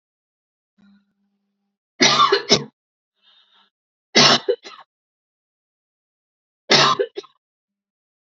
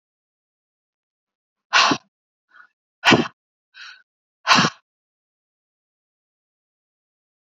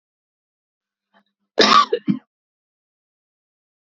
{"three_cough_length": "8.3 s", "three_cough_amplitude": 32768, "three_cough_signal_mean_std_ratio": 0.29, "exhalation_length": "7.4 s", "exhalation_amplitude": 29254, "exhalation_signal_mean_std_ratio": 0.23, "cough_length": "3.8 s", "cough_amplitude": 31931, "cough_signal_mean_std_ratio": 0.24, "survey_phase": "beta (2021-08-13 to 2022-03-07)", "age": "18-44", "gender": "Female", "wearing_mask": "No", "symptom_none": true, "smoker_status": "Never smoked", "respiratory_condition_asthma": false, "respiratory_condition_other": false, "recruitment_source": "REACT", "submission_delay": "0 days", "covid_test_result": "Negative", "covid_test_method": "RT-qPCR", "influenza_a_test_result": "Negative", "influenza_b_test_result": "Negative"}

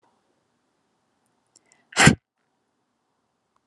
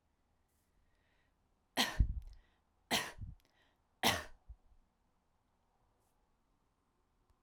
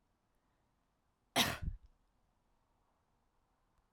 {"exhalation_length": "3.7 s", "exhalation_amplitude": 32223, "exhalation_signal_mean_std_ratio": 0.16, "three_cough_length": "7.4 s", "three_cough_amplitude": 5389, "three_cough_signal_mean_std_ratio": 0.26, "cough_length": "3.9 s", "cough_amplitude": 4545, "cough_signal_mean_std_ratio": 0.22, "survey_phase": "alpha (2021-03-01 to 2021-08-12)", "age": "18-44", "gender": "Female", "wearing_mask": "No", "symptom_headache": true, "smoker_status": "Never smoked", "respiratory_condition_asthma": false, "respiratory_condition_other": false, "recruitment_source": "Test and Trace", "submission_delay": "2 days", "covid_test_result": "Positive", "covid_test_method": "RT-qPCR", "covid_ct_value": 21.7, "covid_ct_gene": "ORF1ab gene", "covid_ct_mean": 22.5, "covid_viral_load": "42000 copies/ml", "covid_viral_load_category": "Low viral load (10K-1M copies/ml)"}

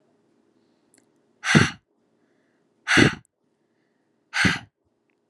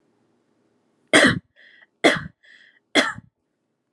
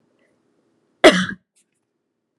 {"exhalation_length": "5.3 s", "exhalation_amplitude": 28601, "exhalation_signal_mean_std_ratio": 0.27, "three_cough_length": "3.9 s", "three_cough_amplitude": 29654, "three_cough_signal_mean_std_ratio": 0.29, "cough_length": "2.4 s", "cough_amplitude": 32768, "cough_signal_mean_std_ratio": 0.21, "survey_phase": "alpha (2021-03-01 to 2021-08-12)", "age": "18-44", "gender": "Female", "wearing_mask": "No", "symptom_none": true, "smoker_status": "Never smoked", "respiratory_condition_asthma": false, "respiratory_condition_other": false, "recruitment_source": "REACT", "submission_delay": "1 day", "covid_test_result": "Negative", "covid_test_method": "RT-qPCR"}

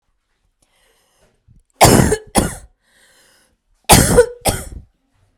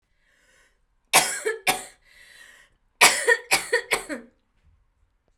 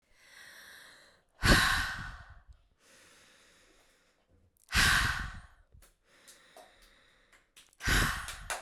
{"cough_length": "5.4 s", "cough_amplitude": 32768, "cough_signal_mean_std_ratio": 0.34, "three_cough_length": "5.4 s", "three_cough_amplitude": 32014, "three_cough_signal_mean_std_ratio": 0.34, "exhalation_length": "8.6 s", "exhalation_amplitude": 10767, "exhalation_signal_mean_std_ratio": 0.36, "survey_phase": "beta (2021-08-13 to 2022-03-07)", "age": "18-44", "gender": "Female", "wearing_mask": "No", "symptom_none": true, "smoker_status": "Never smoked", "respiratory_condition_asthma": false, "respiratory_condition_other": false, "recruitment_source": "REACT", "submission_delay": "1 day", "covid_test_result": "Negative", "covid_test_method": "RT-qPCR"}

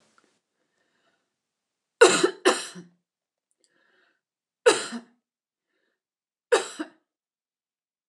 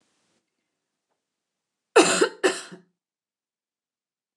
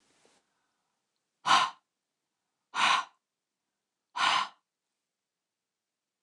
{"three_cough_length": "8.1 s", "three_cough_amplitude": 27906, "three_cough_signal_mean_std_ratio": 0.22, "cough_length": "4.4 s", "cough_amplitude": 25471, "cough_signal_mean_std_ratio": 0.24, "exhalation_length": "6.2 s", "exhalation_amplitude": 9509, "exhalation_signal_mean_std_ratio": 0.28, "survey_phase": "alpha (2021-03-01 to 2021-08-12)", "age": "45-64", "gender": "Female", "wearing_mask": "No", "symptom_headache": true, "symptom_onset": "12 days", "smoker_status": "Never smoked", "respiratory_condition_asthma": false, "respiratory_condition_other": false, "recruitment_source": "REACT", "submission_delay": "1 day", "covid_test_result": "Negative", "covid_test_method": "RT-qPCR"}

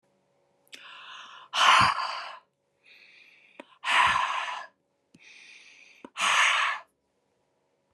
{"exhalation_length": "7.9 s", "exhalation_amplitude": 14933, "exhalation_signal_mean_std_ratio": 0.41, "survey_phase": "beta (2021-08-13 to 2022-03-07)", "age": "45-64", "gender": "Female", "wearing_mask": "No", "symptom_none": true, "smoker_status": "Never smoked", "respiratory_condition_asthma": true, "respiratory_condition_other": false, "recruitment_source": "REACT", "submission_delay": "1 day", "covid_test_result": "Negative", "covid_test_method": "RT-qPCR"}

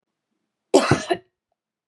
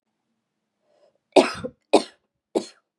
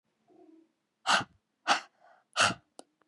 {"cough_length": "1.9 s", "cough_amplitude": 28250, "cough_signal_mean_std_ratio": 0.29, "three_cough_length": "3.0 s", "three_cough_amplitude": 29652, "three_cough_signal_mean_std_ratio": 0.22, "exhalation_length": "3.1 s", "exhalation_amplitude": 9638, "exhalation_signal_mean_std_ratio": 0.31, "survey_phase": "beta (2021-08-13 to 2022-03-07)", "age": "18-44", "gender": "Female", "wearing_mask": "No", "symptom_none": true, "smoker_status": "Never smoked", "respiratory_condition_asthma": false, "respiratory_condition_other": false, "recruitment_source": "REACT", "submission_delay": "2 days", "covid_test_result": "Negative", "covid_test_method": "RT-qPCR", "influenza_a_test_result": "Negative", "influenza_b_test_result": "Negative"}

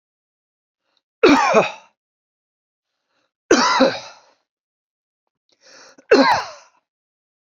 {"three_cough_length": "7.5 s", "three_cough_amplitude": 32112, "three_cough_signal_mean_std_ratio": 0.32, "survey_phase": "beta (2021-08-13 to 2022-03-07)", "age": "45-64", "gender": "Male", "wearing_mask": "No", "symptom_sore_throat": true, "symptom_fatigue": true, "symptom_headache": true, "symptom_onset": "13 days", "smoker_status": "Never smoked", "respiratory_condition_asthma": false, "respiratory_condition_other": false, "recruitment_source": "REACT", "submission_delay": "1 day", "covid_test_result": "Negative", "covid_test_method": "RT-qPCR", "influenza_a_test_result": "Unknown/Void", "influenza_b_test_result": "Unknown/Void"}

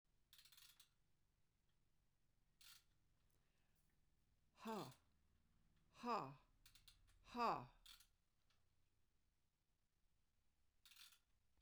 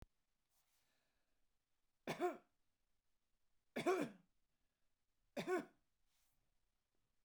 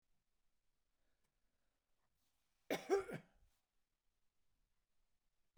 {"exhalation_length": "11.6 s", "exhalation_amplitude": 864, "exhalation_signal_mean_std_ratio": 0.26, "three_cough_length": "7.2 s", "three_cough_amplitude": 1440, "three_cough_signal_mean_std_ratio": 0.27, "cough_length": "5.6 s", "cough_amplitude": 1884, "cough_signal_mean_std_ratio": 0.2, "survey_phase": "beta (2021-08-13 to 2022-03-07)", "age": "65+", "gender": "Female", "wearing_mask": "No", "symptom_none": true, "smoker_status": "Never smoked", "respiratory_condition_asthma": false, "respiratory_condition_other": false, "recruitment_source": "REACT", "submission_delay": "2 days", "covid_test_result": "Negative", "covid_test_method": "RT-qPCR", "influenza_a_test_result": "Negative", "influenza_b_test_result": "Negative"}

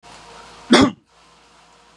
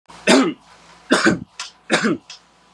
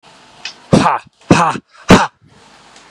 {"cough_length": "2.0 s", "cough_amplitude": 32767, "cough_signal_mean_std_ratio": 0.29, "three_cough_length": "2.7 s", "three_cough_amplitude": 32540, "three_cough_signal_mean_std_ratio": 0.46, "exhalation_length": "2.9 s", "exhalation_amplitude": 32768, "exhalation_signal_mean_std_ratio": 0.39, "survey_phase": "beta (2021-08-13 to 2022-03-07)", "age": "18-44", "gender": "Male", "wearing_mask": "No", "symptom_none": true, "smoker_status": "Never smoked", "respiratory_condition_asthma": false, "respiratory_condition_other": false, "recruitment_source": "REACT", "submission_delay": "3 days", "covid_test_result": "Negative", "covid_test_method": "RT-qPCR", "influenza_a_test_result": "Negative", "influenza_b_test_result": "Negative"}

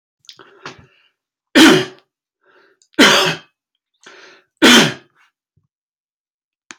{"three_cough_length": "6.8 s", "three_cough_amplitude": 32767, "three_cough_signal_mean_std_ratio": 0.31, "survey_phase": "alpha (2021-03-01 to 2021-08-12)", "age": "45-64", "gender": "Male", "wearing_mask": "No", "symptom_none": true, "smoker_status": "Never smoked", "respiratory_condition_asthma": false, "respiratory_condition_other": false, "recruitment_source": "REACT", "submission_delay": "3 days", "covid_test_result": "Negative", "covid_test_method": "RT-qPCR"}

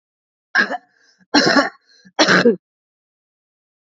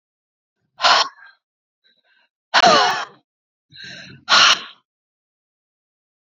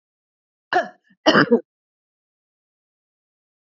{"three_cough_length": "3.8 s", "three_cough_amplitude": 30060, "three_cough_signal_mean_std_ratio": 0.37, "exhalation_length": "6.2 s", "exhalation_amplitude": 32767, "exhalation_signal_mean_std_ratio": 0.33, "cough_length": "3.8 s", "cough_amplitude": 28157, "cough_signal_mean_std_ratio": 0.24, "survey_phase": "beta (2021-08-13 to 2022-03-07)", "age": "45-64", "gender": "Female", "wearing_mask": "No", "symptom_none": true, "symptom_onset": "5 days", "smoker_status": "Ex-smoker", "respiratory_condition_asthma": true, "respiratory_condition_other": false, "recruitment_source": "REACT", "submission_delay": "3 days", "covid_test_result": "Negative", "covid_test_method": "RT-qPCR", "influenza_a_test_result": "Negative", "influenza_b_test_result": "Negative"}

